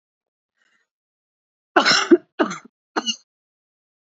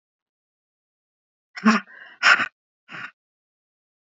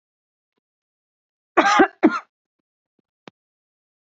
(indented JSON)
{
  "three_cough_length": "4.1 s",
  "three_cough_amplitude": 27627,
  "three_cough_signal_mean_std_ratio": 0.27,
  "exhalation_length": "4.2 s",
  "exhalation_amplitude": 27523,
  "exhalation_signal_mean_std_ratio": 0.25,
  "cough_length": "4.2 s",
  "cough_amplitude": 27490,
  "cough_signal_mean_std_ratio": 0.24,
  "survey_phase": "beta (2021-08-13 to 2022-03-07)",
  "age": "45-64",
  "gender": "Female",
  "wearing_mask": "No",
  "symptom_cough_any": true,
  "symptom_runny_or_blocked_nose": true,
  "symptom_change_to_sense_of_smell_or_taste": true,
  "symptom_onset": "4 days",
  "smoker_status": "Ex-smoker",
  "respiratory_condition_asthma": false,
  "respiratory_condition_other": false,
  "recruitment_source": "Test and Trace",
  "submission_delay": "1 day",
  "covid_test_result": "Positive",
  "covid_test_method": "RT-qPCR",
  "covid_ct_value": 19.3,
  "covid_ct_gene": "ORF1ab gene"
}